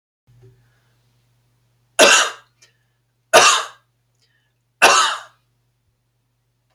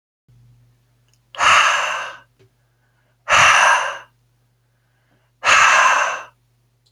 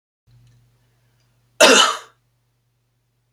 {
  "three_cough_length": "6.7 s",
  "three_cough_amplitude": 32768,
  "three_cough_signal_mean_std_ratio": 0.29,
  "exhalation_length": "6.9 s",
  "exhalation_amplitude": 31376,
  "exhalation_signal_mean_std_ratio": 0.45,
  "cough_length": "3.3 s",
  "cough_amplitude": 32767,
  "cough_signal_mean_std_ratio": 0.26,
  "survey_phase": "beta (2021-08-13 to 2022-03-07)",
  "age": "18-44",
  "gender": "Male",
  "wearing_mask": "No",
  "symptom_none": true,
  "smoker_status": "Never smoked",
  "respiratory_condition_asthma": false,
  "respiratory_condition_other": false,
  "recruitment_source": "REACT",
  "submission_delay": "1 day",
  "covid_test_result": "Negative",
  "covid_test_method": "RT-qPCR"
}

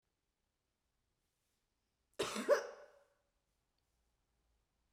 {
  "cough_length": "4.9 s",
  "cough_amplitude": 3178,
  "cough_signal_mean_std_ratio": 0.21,
  "survey_phase": "beta (2021-08-13 to 2022-03-07)",
  "age": "45-64",
  "gender": "Female",
  "wearing_mask": "No",
  "symptom_cough_any": true,
  "symptom_new_continuous_cough": true,
  "symptom_runny_or_blocked_nose": true,
  "symptom_fatigue": true,
  "symptom_onset": "4 days",
  "smoker_status": "Never smoked",
  "respiratory_condition_asthma": true,
  "respiratory_condition_other": false,
  "recruitment_source": "REACT",
  "submission_delay": "1 day",
  "covid_test_result": "Negative",
  "covid_test_method": "RT-qPCR",
  "influenza_a_test_result": "Unknown/Void",
  "influenza_b_test_result": "Unknown/Void"
}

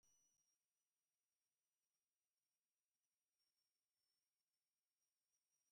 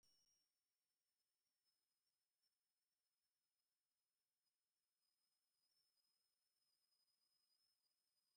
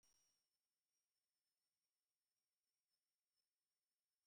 {
  "exhalation_length": "5.7 s",
  "exhalation_amplitude": 9,
  "exhalation_signal_mean_std_ratio": 0.49,
  "three_cough_length": "8.4 s",
  "three_cough_amplitude": 10,
  "three_cough_signal_mean_std_ratio": 0.6,
  "cough_length": "4.3 s",
  "cough_amplitude": 12,
  "cough_signal_mean_std_ratio": 0.44,
  "survey_phase": "beta (2021-08-13 to 2022-03-07)",
  "age": "65+",
  "gender": "Male",
  "wearing_mask": "No",
  "symptom_none": true,
  "smoker_status": "Never smoked",
  "respiratory_condition_asthma": false,
  "respiratory_condition_other": false,
  "recruitment_source": "REACT",
  "submission_delay": "2 days",
  "covid_test_result": "Negative",
  "covid_test_method": "RT-qPCR",
  "influenza_a_test_result": "Negative",
  "influenza_b_test_result": "Negative"
}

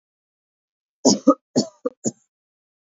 {
  "three_cough_length": "2.8 s",
  "three_cough_amplitude": 27653,
  "three_cough_signal_mean_std_ratio": 0.26,
  "survey_phase": "beta (2021-08-13 to 2022-03-07)",
  "age": "18-44",
  "gender": "Female",
  "wearing_mask": "No",
  "symptom_cough_any": true,
  "symptom_runny_or_blocked_nose": true,
  "symptom_shortness_of_breath": true,
  "symptom_sore_throat": true,
  "symptom_fatigue": true,
  "symptom_headache": true,
  "symptom_change_to_sense_of_smell_or_taste": true,
  "symptom_loss_of_taste": true,
  "symptom_other": true,
  "symptom_onset": "5 days",
  "smoker_status": "Never smoked",
  "respiratory_condition_asthma": false,
  "respiratory_condition_other": false,
  "recruitment_source": "Test and Trace",
  "submission_delay": "1 day",
  "covid_test_result": "Positive",
  "covid_test_method": "RT-qPCR",
  "covid_ct_value": 15.0,
  "covid_ct_gene": "ORF1ab gene"
}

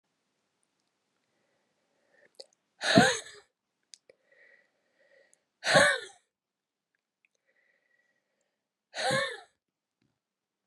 {
  "exhalation_length": "10.7 s",
  "exhalation_amplitude": 16760,
  "exhalation_signal_mean_std_ratio": 0.23,
  "survey_phase": "beta (2021-08-13 to 2022-03-07)",
  "age": "45-64",
  "gender": "Female",
  "wearing_mask": "No",
  "symptom_cough_any": true,
  "symptom_runny_or_blocked_nose": true,
  "symptom_shortness_of_breath": true,
  "symptom_diarrhoea": true,
  "symptom_fatigue": true,
  "symptom_headache": true,
  "symptom_onset": "6 days",
  "smoker_status": "Never smoked",
  "respiratory_condition_asthma": true,
  "respiratory_condition_other": false,
  "recruitment_source": "Test and Trace",
  "submission_delay": "2 days",
  "covid_test_result": "Positive",
  "covid_test_method": "RT-qPCR",
  "covid_ct_value": 25.1,
  "covid_ct_gene": "ORF1ab gene"
}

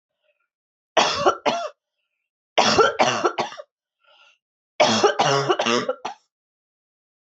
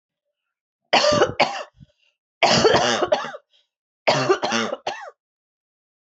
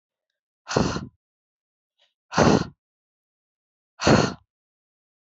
{
  "three_cough_length": "7.3 s",
  "three_cough_amplitude": 24722,
  "three_cough_signal_mean_std_ratio": 0.45,
  "cough_length": "6.1 s",
  "cough_amplitude": 25681,
  "cough_signal_mean_std_ratio": 0.47,
  "exhalation_length": "5.3 s",
  "exhalation_amplitude": 24087,
  "exhalation_signal_mean_std_ratio": 0.29,
  "survey_phase": "alpha (2021-03-01 to 2021-08-12)",
  "age": "45-64",
  "gender": "Female",
  "wearing_mask": "No",
  "symptom_cough_any": true,
  "symptom_abdominal_pain": true,
  "symptom_fatigue": true,
  "symptom_fever_high_temperature": true,
  "symptom_headache": true,
  "symptom_onset": "3 days",
  "smoker_status": "Never smoked",
  "respiratory_condition_asthma": false,
  "respiratory_condition_other": false,
  "recruitment_source": "Test and Trace",
  "submission_delay": "2 days",
  "covid_test_result": "Positive",
  "covid_test_method": "RT-qPCR",
  "covid_ct_value": 28.6,
  "covid_ct_gene": "ORF1ab gene",
  "covid_ct_mean": 28.7,
  "covid_viral_load": "380 copies/ml",
  "covid_viral_load_category": "Minimal viral load (< 10K copies/ml)"
}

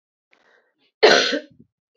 {
  "cough_length": "2.0 s",
  "cough_amplitude": 27437,
  "cough_signal_mean_std_ratio": 0.32,
  "survey_phase": "beta (2021-08-13 to 2022-03-07)",
  "age": "45-64",
  "gender": "Female",
  "wearing_mask": "No",
  "symptom_cough_any": true,
  "symptom_runny_or_blocked_nose": true,
  "symptom_onset": "3 days",
  "smoker_status": "Ex-smoker",
  "respiratory_condition_asthma": false,
  "respiratory_condition_other": false,
  "recruitment_source": "Test and Trace",
  "submission_delay": "2 days",
  "covid_test_result": "Positive",
  "covid_test_method": "ePCR"
}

